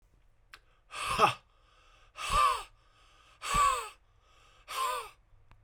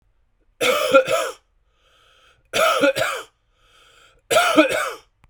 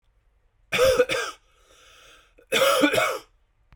{"exhalation_length": "5.6 s", "exhalation_amplitude": 9818, "exhalation_signal_mean_std_ratio": 0.42, "three_cough_length": "5.3 s", "three_cough_amplitude": 32767, "three_cough_signal_mean_std_ratio": 0.48, "cough_length": "3.8 s", "cough_amplitude": 15479, "cough_signal_mean_std_ratio": 0.48, "survey_phase": "beta (2021-08-13 to 2022-03-07)", "age": "45-64", "gender": "Male", "wearing_mask": "No", "symptom_cough_any": true, "symptom_runny_or_blocked_nose": true, "symptom_fatigue": true, "symptom_headache": true, "symptom_change_to_sense_of_smell_or_taste": true, "symptom_loss_of_taste": true, "symptom_onset": "5 days", "smoker_status": "Ex-smoker", "respiratory_condition_asthma": false, "respiratory_condition_other": false, "recruitment_source": "Test and Trace", "submission_delay": "1 day", "covid_test_result": "Positive", "covid_test_method": "RT-qPCR", "covid_ct_value": 15.1, "covid_ct_gene": "ORF1ab gene", "covid_ct_mean": 16.7, "covid_viral_load": "3400000 copies/ml", "covid_viral_load_category": "High viral load (>1M copies/ml)"}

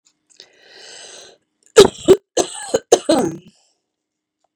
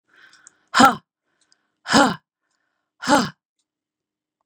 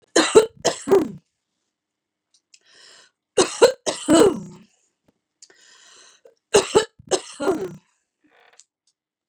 {"cough_length": "4.6 s", "cough_amplitude": 32768, "cough_signal_mean_std_ratio": 0.27, "exhalation_length": "4.5 s", "exhalation_amplitude": 32289, "exhalation_signal_mean_std_ratio": 0.27, "three_cough_length": "9.3 s", "three_cough_amplitude": 30696, "three_cough_signal_mean_std_ratio": 0.32, "survey_phase": "beta (2021-08-13 to 2022-03-07)", "age": "45-64", "gender": "Female", "wearing_mask": "No", "symptom_none": true, "smoker_status": "Ex-smoker", "respiratory_condition_asthma": false, "respiratory_condition_other": false, "recruitment_source": "REACT", "submission_delay": "2 days", "covid_test_result": "Negative", "covid_test_method": "RT-qPCR", "influenza_a_test_result": "Negative", "influenza_b_test_result": "Negative"}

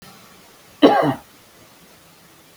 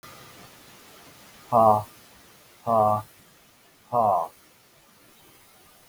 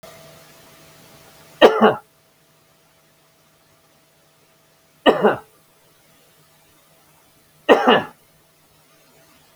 {"cough_length": "2.6 s", "cough_amplitude": 32768, "cough_signal_mean_std_ratio": 0.3, "exhalation_length": "5.9 s", "exhalation_amplitude": 16245, "exhalation_signal_mean_std_ratio": 0.35, "three_cough_length": "9.6 s", "three_cough_amplitude": 32768, "three_cough_signal_mean_std_ratio": 0.24, "survey_phase": "beta (2021-08-13 to 2022-03-07)", "age": "65+", "gender": "Male", "wearing_mask": "No", "symptom_new_continuous_cough": true, "symptom_onset": "12 days", "smoker_status": "Never smoked", "respiratory_condition_asthma": false, "respiratory_condition_other": false, "recruitment_source": "REACT", "submission_delay": "1 day", "covid_test_result": "Negative", "covid_test_method": "RT-qPCR", "influenza_a_test_result": "Negative", "influenza_b_test_result": "Negative"}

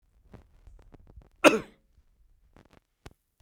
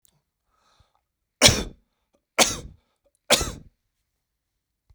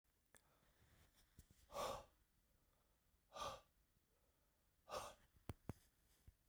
{"cough_length": "3.4 s", "cough_amplitude": 32511, "cough_signal_mean_std_ratio": 0.16, "three_cough_length": "4.9 s", "three_cough_amplitude": 32768, "three_cough_signal_mean_std_ratio": 0.23, "exhalation_length": "6.5 s", "exhalation_amplitude": 924, "exhalation_signal_mean_std_ratio": 0.35, "survey_phase": "beta (2021-08-13 to 2022-03-07)", "age": "65+", "gender": "Male", "wearing_mask": "No", "symptom_none": true, "smoker_status": "Never smoked", "respiratory_condition_asthma": false, "respiratory_condition_other": false, "recruitment_source": "REACT", "submission_delay": "2 days", "covid_test_result": "Negative", "covid_test_method": "RT-qPCR", "influenza_a_test_result": "Negative", "influenza_b_test_result": "Negative"}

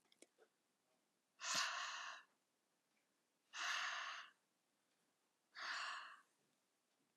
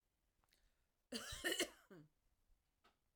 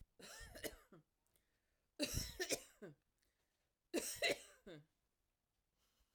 {"exhalation_length": "7.2 s", "exhalation_amplitude": 1174, "exhalation_signal_mean_std_ratio": 0.44, "cough_length": "3.2 s", "cough_amplitude": 1331, "cough_signal_mean_std_ratio": 0.32, "three_cough_length": "6.1 s", "three_cough_amplitude": 1512, "three_cough_signal_mean_std_ratio": 0.35, "survey_phase": "alpha (2021-03-01 to 2021-08-12)", "age": "45-64", "gender": "Female", "wearing_mask": "No", "symptom_none": true, "symptom_onset": "12 days", "smoker_status": "Never smoked", "respiratory_condition_asthma": false, "respiratory_condition_other": false, "recruitment_source": "REACT", "submission_delay": "3 days", "covid_test_result": "Negative", "covid_test_method": "RT-qPCR"}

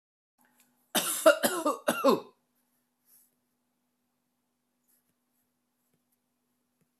{"cough_length": "7.0 s", "cough_amplitude": 14215, "cough_signal_mean_std_ratio": 0.25, "survey_phase": "beta (2021-08-13 to 2022-03-07)", "age": "65+", "gender": "Female", "wearing_mask": "No", "symptom_none": true, "smoker_status": "Ex-smoker", "respiratory_condition_asthma": false, "respiratory_condition_other": false, "recruitment_source": "REACT", "submission_delay": "1 day", "covid_test_result": "Negative", "covid_test_method": "RT-qPCR"}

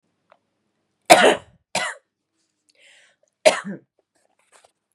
{"cough_length": "4.9 s", "cough_amplitude": 32768, "cough_signal_mean_std_ratio": 0.23, "survey_phase": "beta (2021-08-13 to 2022-03-07)", "age": "45-64", "gender": "Female", "wearing_mask": "Yes", "symptom_shortness_of_breath": true, "symptom_headache": true, "symptom_onset": "9 days", "smoker_status": "Ex-smoker", "respiratory_condition_asthma": true, "respiratory_condition_other": false, "recruitment_source": "REACT", "submission_delay": "2 days", "covid_test_result": "Negative", "covid_test_method": "RT-qPCR", "influenza_a_test_result": "Unknown/Void", "influenza_b_test_result": "Unknown/Void"}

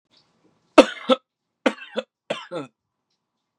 {"three_cough_length": "3.6 s", "three_cough_amplitude": 32768, "three_cough_signal_mean_std_ratio": 0.21, "survey_phase": "beta (2021-08-13 to 2022-03-07)", "age": "18-44", "gender": "Male", "wearing_mask": "No", "symptom_cough_any": true, "symptom_runny_or_blocked_nose": true, "smoker_status": "Current smoker (e-cigarettes or vapes only)", "respiratory_condition_asthma": false, "respiratory_condition_other": false, "recruitment_source": "REACT", "submission_delay": "7 days", "covid_test_result": "Negative", "covid_test_method": "RT-qPCR"}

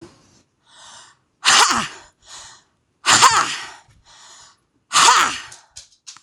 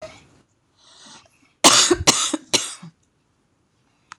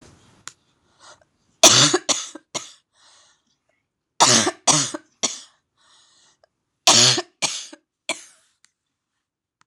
{"exhalation_length": "6.2 s", "exhalation_amplitude": 26028, "exhalation_signal_mean_std_ratio": 0.38, "cough_length": "4.2 s", "cough_amplitude": 26028, "cough_signal_mean_std_ratio": 0.32, "three_cough_length": "9.7 s", "three_cough_amplitude": 26028, "three_cough_signal_mean_std_ratio": 0.31, "survey_phase": "beta (2021-08-13 to 2022-03-07)", "age": "45-64", "gender": "Female", "wearing_mask": "No", "symptom_cough_any": true, "symptom_fatigue": true, "symptom_onset": "12 days", "smoker_status": "Never smoked", "respiratory_condition_asthma": false, "respiratory_condition_other": false, "recruitment_source": "REACT", "submission_delay": "1 day", "covid_test_result": "Negative", "covid_test_method": "RT-qPCR", "influenza_a_test_result": "Negative", "influenza_b_test_result": "Negative"}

